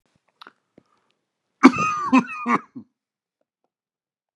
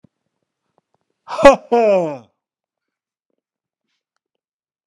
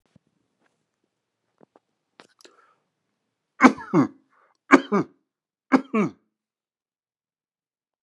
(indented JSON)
{
  "cough_length": "4.4 s",
  "cough_amplitude": 32768,
  "cough_signal_mean_std_ratio": 0.27,
  "exhalation_length": "4.9 s",
  "exhalation_amplitude": 32768,
  "exhalation_signal_mean_std_ratio": 0.26,
  "three_cough_length": "8.0 s",
  "three_cough_amplitude": 32768,
  "three_cough_signal_mean_std_ratio": 0.2,
  "survey_phase": "beta (2021-08-13 to 2022-03-07)",
  "age": "45-64",
  "gender": "Male",
  "wearing_mask": "Yes",
  "symptom_none": true,
  "smoker_status": "Never smoked",
  "respiratory_condition_asthma": false,
  "respiratory_condition_other": false,
  "recruitment_source": "REACT",
  "submission_delay": "1 day",
  "covid_test_result": "Negative",
  "covid_test_method": "RT-qPCR"
}